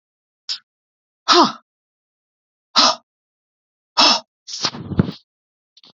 {"exhalation_length": "6.0 s", "exhalation_amplitude": 32767, "exhalation_signal_mean_std_ratio": 0.31, "survey_phase": "beta (2021-08-13 to 2022-03-07)", "age": "18-44", "gender": "Male", "wearing_mask": "No", "symptom_none": true, "smoker_status": "Never smoked", "respiratory_condition_asthma": true, "respiratory_condition_other": false, "recruitment_source": "REACT", "submission_delay": "1 day", "covid_test_result": "Negative", "covid_test_method": "RT-qPCR", "influenza_a_test_result": "Negative", "influenza_b_test_result": "Negative"}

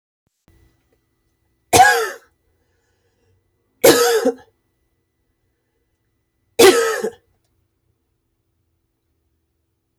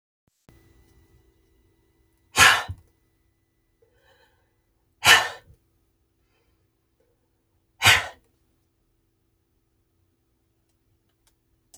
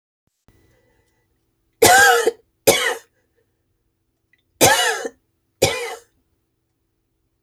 {"three_cough_length": "10.0 s", "three_cough_amplitude": 31887, "three_cough_signal_mean_std_ratio": 0.28, "exhalation_length": "11.8 s", "exhalation_amplitude": 29078, "exhalation_signal_mean_std_ratio": 0.19, "cough_length": "7.4 s", "cough_amplitude": 32768, "cough_signal_mean_std_ratio": 0.33, "survey_phase": "beta (2021-08-13 to 2022-03-07)", "age": "65+", "gender": "Female", "wearing_mask": "No", "symptom_cough_any": true, "smoker_status": "Ex-smoker", "respiratory_condition_asthma": false, "respiratory_condition_other": false, "recruitment_source": "REACT", "submission_delay": "5 days", "covid_test_result": "Negative", "covid_test_method": "RT-qPCR", "influenza_a_test_result": "Negative", "influenza_b_test_result": "Negative"}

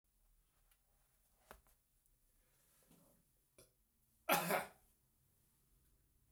{"cough_length": "6.3 s", "cough_amplitude": 3169, "cough_signal_mean_std_ratio": 0.21, "survey_phase": "beta (2021-08-13 to 2022-03-07)", "age": "65+", "gender": "Male", "wearing_mask": "No", "symptom_cough_any": true, "symptom_runny_or_blocked_nose": true, "symptom_fatigue": true, "symptom_headache": true, "smoker_status": "Never smoked", "respiratory_condition_asthma": false, "respiratory_condition_other": false, "recruitment_source": "Test and Trace", "submission_delay": "2 days", "covid_test_result": "Positive", "covid_test_method": "RT-qPCR", "covid_ct_value": 23.6, "covid_ct_gene": "ORF1ab gene", "covid_ct_mean": 24.5, "covid_viral_load": "9300 copies/ml", "covid_viral_load_category": "Minimal viral load (< 10K copies/ml)"}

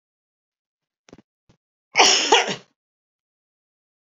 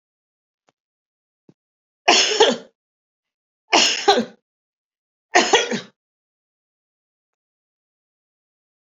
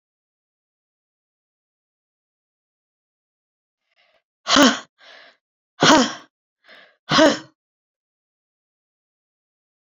{"cough_length": "4.2 s", "cough_amplitude": 29231, "cough_signal_mean_std_ratio": 0.27, "three_cough_length": "8.9 s", "three_cough_amplitude": 29943, "three_cough_signal_mean_std_ratio": 0.29, "exhalation_length": "9.8 s", "exhalation_amplitude": 31812, "exhalation_signal_mean_std_ratio": 0.22, "survey_phase": "beta (2021-08-13 to 2022-03-07)", "age": "65+", "gender": "Female", "wearing_mask": "No", "symptom_none": true, "smoker_status": "Never smoked", "respiratory_condition_asthma": true, "respiratory_condition_other": false, "recruitment_source": "REACT", "submission_delay": "1 day", "covid_test_result": "Negative", "covid_test_method": "RT-qPCR", "influenza_a_test_result": "Negative", "influenza_b_test_result": "Negative"}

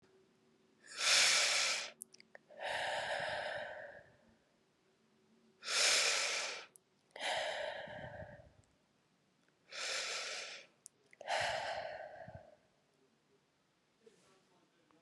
{"exhalation_length": "15.0 s", "exhalation_amplitude": 4605, "exhalation_signal_mean_std_ratio": 0.48, "survey_phase": "beta (2021-08-13 to 2022-03-07)", "age": "18-44", "gender": "Female", "wearing_mask": "No", "symptom_cough_any": true, "symptom_runny_or_blocked_nose": true, "symptom_abdominal_pain": true, "symptom_fatigue": true, "symptom_change_to_sense_of_smell_or_taste": true, "symptom_loss_of_taste": true, "symptom_onset": "3 days", "smoker_status": "Never smoked", "respiratory_condition_asthma": false, "respiratory_condition_other": false, "recruitment_source": "Test and Trace", "submission_delay": "1 day", "covid_test_result": "Positive", "covid_test_method": "RT-qPCR"}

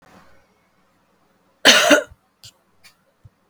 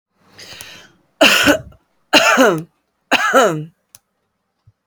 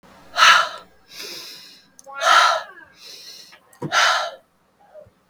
{"cough_length": "3.5 s", "cough_amplitude": 32768, "cough_signal_mean_std_ratio": 0.26, "three_cough_length": "4.9 s", "three_cough_amplitude": 32768, "three_cough_signal_mean_std_ratio": 0.43, "exhalation_length": "5.3 s", "exhalation_amplitude": 32768, "exhalation_signal_mean_std_ratio": 0.41, "survey_phase": "beta (2021-08-13 to 2022-03-07)", "age": "45-64", "gender": "Female", "wearing_mask": "No", "symptom_runny_or_blocked_nose": true, "symptom_sore_throat": true, "symptom_onset": "5 days", "smoker_status": "Ex-smoker", "respiratory_condition_asthma": false, "respiratory_condition_other": false, "recruitment_source": "REACT", "submission_delay": "4 days", "covid_test_result": "Negative", "covid_test_method": "RT-qPCR", "covid_ct_value": 37.7, "covid_ct_gene": "E gene", "influenza_a_test_result": "Negative", "influenza_b_test_result": "Negative"}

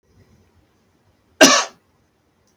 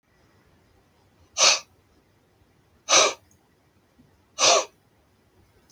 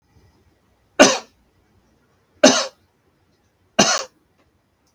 {"cough_length": "2.6 s", "cough_amplitude": 32768, "cough_signal_mean_std_ratio": 0.23, "exhalation_length": "5.7 s", "exhalation_amplitude": 25278, "exhalation_signal_mean_std_ratio": 0.28, "three_cough_length": "4.9 s", "three_cough_amplitude": 32768, "three_cough_signal_mean_std_ratio": 0.25, "survey_phase": "beta (2021-08-13 to 2022-03-07)", "age": "45-64", "gender": "Male", "wearing_mask": "No", "symptom_headache": true, "smoker_status": "Never smoked", "respiratory_condition_asthma": false, "respiratory_condition_other": false, "recruitment_source": "REACT", "submission_delay": "3 days", "covid_test_result": "Negative", "covid_test_method": "RT-qPCR", "influenza_a_test_result": "Negative", "influenza_b_test_result": "Negative"}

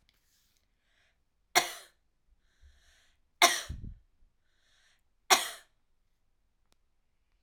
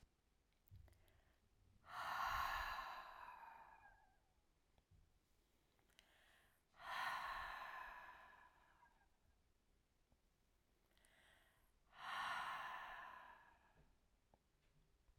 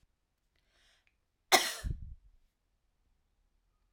{"three_cough_length": "7.4 s", "three_cough_amplitude": 15941, "three_cough_signal_mean_std_ratio": 0.19, "exhalation_length": "15.2 s", "exhalation_amplitude": 718, "exhalation_signal_mean_std_ratio": 0.47, "cough_length": "3.9 s", "cough_amplitude": 12860, "cough_signal_mean_std_ratio": 0.21, "survey_phase": "alpha (2021-03-01 to 2021-08-12)", "age": "65+", "gender": "Female", "wearing_mask": "No", "symptom_fatigue": true, "symptom_headache": true, "symptom_onset": "12 days", "smoker_status": "Never smoked", "respiratory_condition_asthma": false, "respiratory_condition_other": false, "recruitment_source": "REACT", "submission_delay": "1 day", "covid_test_result": "Negative", "covid_test_method": "RT-qPCR"}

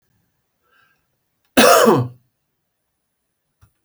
{"cough_length": "3.8 s", "cough_amplitude": 32768, "cough_signal_mean_std_ratio": 0.29, "survey_phase": "beta (2021-08-13 to 2022-03-07)", "age": "45-64", "gender": "Male", "wearing_mask": "No", "symptom_none": true, "smoker_status": "Ex-smoker", "respiratory_condition_asthma": false, "respiratory_condition_other": false, "recruitment_source": "REACT", "submission_delay": "4 days", "covid_test_result": "Negative", "covid_test_method": "RT-qPCR", "influenza_a_test_result": "Negative", "influenza_b_test_result": "Negative"}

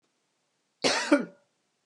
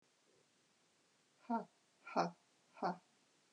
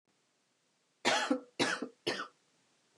{"cough_length": "1.9 s", "cough_amplitude": 11165, "cough_signal_mean_std_ratio": 0.33, "exhalation_length": "3.5 s", "exhalation_amplitude": 3074, "exhalation_signal_mean_std_ratio": 0.29, "three_cough_length": "3.0 s", "three_cough_amplitude": 5418, "three_cough_signal_mean_std_ratio": 0.4, "survey_phase": "beta (2021-08-13 to 2022-03-07)", "age": "45-64", "gender": "Female", "wearing_mask": "No", "symptom_cough_any": true, "symptom_runny_or_blocked_nose": true, "symptom_sore_throat": true, "symptom_fatigue": true, "symptom_headache": true, "symptom_onset": "2 days", "smoker_status": "Never smoked", "respiratory_condition_asthma": false, "respiratory_condition_other": false, "recruitment_source": "Test and Trace", "submission_delay": "1 day", "covid_test_result": "Positive", "covid_test_method": "ePCR"}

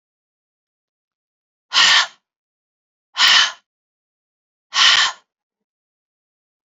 {"exhalation_length": "6.7 s", "exhalation_amplitude": 32696, "exhalation_signal_mean_std_ratio": 0.31, "survey_phase": "beta (2021-08-13 to 2022-03-07)", "age": "18-44", "gender": "Female", "wearing_mask": "No", "symptom_runny_or_blocked_nose": true, "symptom_headache": true, "symptom_onset": "8 days", "smoker_status": "Never smoked", "respiratory_condition_asthma": false, "respiratory_condition_other": false, "recruitment_source": "REACT", "submission_delay": "1 day", "covid_test_result": "Negative", "covid_test_method": "RT-qPCR"}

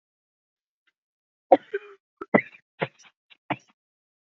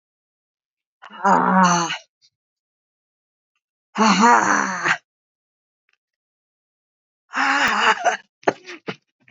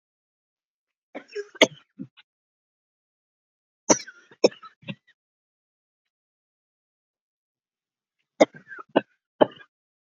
{"cough_length": "4.3 s", "cough_amplitude": 27264, "cough_signal_mean_std_ratio": 0.16, "exhalation_length": "9.3 s", "exhalation_amplitude": 30814, "exhalation_signal_mean_std_ratio": 0.41, "three_cough_length": "10.1 s", "three_cough_amplitude": 32768, "three_cough_signal_mean_std_ratio": 0.14, "survey_phase": "beta (2021-08-13 to 2022-03-07)", "age": "45-64", "gender": "Female", "wearing_mask": "No", "symptom_cough_any": true, "symptom_runny_or_blocked_nose": true, "symptom_headache": true, "symptom_onset": "2 days", "smoker_status": "Never smoked", "respiratory_condition_asthma": false, "respiratory_condition_other": false, "recruitment_source": "Test and Trace", "submission_delay": "1 day", "covid_test_result": "Positive", "covid_test_method": "RT-qPCR", "covid_ct_value": 21.4, "covid_ct_gene": "ORF1ab gene"}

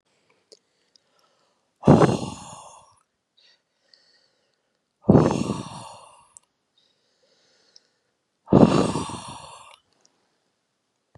{"exhalation_length": "11.2 s", "exhalation_amplitude": 31103, "exhalation_signal_mean_std_ratio": 0.26, "survey_phase": "beta (2021-08-13 to 2022-03-07)", "age": "18-44", "gender": "Male", "wearing_mask": "No", "symptom_none": true, "smoker_status": "Ex-smoker", "respiratory_condition_asthma": false, "respiratory_condition_other": false, "recruitment_source": "REACT", "submission_delay": "2 days", "covid_test_result": "Negative", "covid_test_method": "RT-qPCR", "influenza_a_test_result": "Negative", "influenza_b_test_result": "Negative"}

